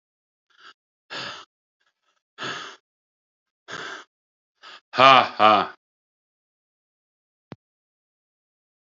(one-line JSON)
{"exhalation_length": "9.0 s", "exhalation_amplitude": 28537, "exhalation_signal_mean_std_ratio": 0.21, "survey_phase": "alpha (2021-03-01 to 2021-08-12)", "age": "45-64", "gender": "Male", "wearing_mask": "No", "symptom_cough_any": true, "symptom_diarrhoea": true, "symptom_fever_high_temperature": true, "symptom_headache": true, "symptom_onset": "3 days", "smoker_status": "Never smoked", "respiratory_condition_asthma": false, "respiratory_condition_other": false, "recruitment_source": "Test and Trace", "submission_delay": "2 days", "covid_test_result": "Positive", "covid_test_method": "RT-qPCR"}